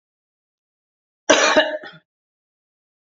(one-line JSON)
{"cough_length": "3.1 s", "cough_amplitude": 28202, "cough_signal_mean_std_ratio": 0.29, "survey_phase": "beta (2021-08-13 to 2022-03-07)", "age": "65+", "gender": "Female", "wearing_mask": "No", "symptom_none": true, "smoker_status": "Never smoked", "respiratory_condition_asthma": false, "respiratory_condition_other": false, "recruitment_source": "REACT", "submission_delay": "1 day", "covid_test_result": "Negative", "covid_test_method": "RT-qPCR", "influenza_a_test_result": "Negative", "influenza_b_test_result": "Negative"}